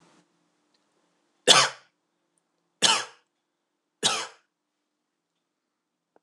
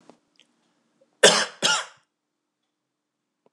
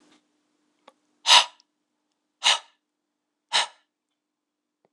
{
  "three_cough_length": "6.2 s",
  "three_cough_amplitude": 26014,
  "three_cough_signal_mean_std_ratio": 0.22,
  "cough_length": "3.5 s",
  "cough_amplitude": 26028,
  "cough_signal_mean_std_ratio": 0.24,
  "exhalation_length": "4.9 s",
  "exhalation_amplitude": 26028,
  "exhalation_signal_mean_std_ratio": 0.21,
  "survey_phase": "beta (2021-08-13 to 2022-03-07)",
  "age": "45-64",
  "gender": "Male",
  "wearing_mask": "No",
  "symptom_cough_any": true,
  "symptom_runny_or_blocked_nose": true,
  "symptom_change_to_sense_of_smell_or_taste": true,
  "symptom_loss_of_taste": true,
  "symptom_onset": "2 days",
  "smoker_status": "Never smoked",
  "respiratory_condition_asthma": false,
  "respiratory_condition_other": false,
  "recruitment_source": "Test and Trace",
  "submission_delay": "1 day",
  "covid_test_result": "Positive",
  "covid_test_method": "RT-qPCR",
  "covid_ct_value": 16.0,
  "covid_ct_gene": "N gene",
  "covid_ct_mean": 16.3,
  "covid_viral_load": "4400000 copies/ml",
  "covid_viral_load_category": "High viral load (>1M copies/ml)"
}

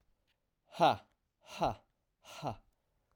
{
  "exhalation_length": "3.2 s",
  "exhalation_amplitude": 6297,
  "exhalation_signal_mean_std_ratio": 0.28,
  "survey_phase": "alpha (2021-03-01 to 2021-08-12)",
  "age": "45-64",
  "gender": "Male",
  "wearing_mask": "No",
  "symptom_cough_any": true,
  "symptom_fever_high_temperature": true,
  "symptom_headache": true,
  "symptom_onset": "3 days",
  "smoker_status": "Never smoked",
  "respiratory_condition_asthma": false,
  "respiratory_condition_other": false,
  "recruitment_source": "Test and Trace",
  "submission_delay": "1 day",
  "covid_test_result": "Positive",
  "covid_test_method": "RT-qPCR",
  "covid_ct_value": 18.1,
  "covid_ct_gene": "ORF1ab gene"
}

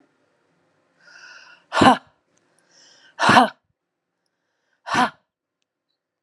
{
  "exhalation_length": "6.2 s",
  "exhalation_amplitude": 32636,
  "exhalation_signal_mean_std_ratio": 0.25,
  "survey_phase": "beta (2021-08-13 to 2022-03-07)",
  "age": "45-64",
  "gender": "Female",
  "wearing_mask": "No",
  "symptom_shortness_of_breath": true,
  "symptom_fatigue": true,
  "smoker_status": "Never smoked",
  "respiratory_condition_asthma": false,
  "respiratory_condition_other": false,
  "recruitment_source": "REACT",
  "submission_delay": "1 day",
  "covid_test_result": "Negative",
  "covid_test_method": "RT-qPCR",
  "influenza_a_test_result": "Negative",
  "influenza_b_test_result": "Negative"
}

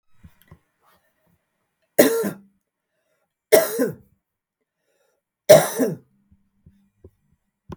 {
  "three_cough_length": "7.8 s",
  "three_cough_amplitude": 32768,
  "three_cough_signal_mean_std_ratio": 0.25,
  "survey_phase": "beta (2021-08-13 to 2022-03-07)",
  "age": "45-64",
  "gender": "Female",
  "wearing_mask": "No",
  "symptom_sore_throat": true,
  "smoker_status": "Never smoked",
  "respiratory_condition_asthma": false,
  "respiratory_condition_other": false,
  "recruitment_source": "Test and Trace",
  "submission_delay": "0 days",
  "covid_test_result": "Negative",
  "covid_test_method": "LFT"
}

